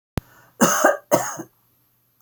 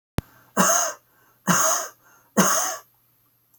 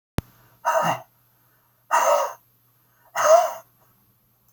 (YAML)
cough_length: 2.2 s
cough_amplitude: 29107
cough_signal_mean_std_ratio: 0.39
three_cough_length: 3.6 s
three_cough_amplitude: 22178
three_cough_signal_mean_std_ratio: 0.47
exhalation_length: 4.5 s
exhalation_amplitude: 20738
exhalation_signal_mean_std_ratio: 0.39
survey_phase: beta (2021-08-13 to 2022-03-07)
age: 65+
gender: Male
wearing_mask: 'No'
symptom_none: true
smoker_status: Never smoked
respiratory_condition_asthma: false
respiratory_condition_other: false
recruitment_source: REACT
submission_delay: 2 days
covid_test_result: Negative
covid_test_method: RT-qPCR
influenza_a_test_result: Unknown/Void
influenza_b_test_result: Unknown/Void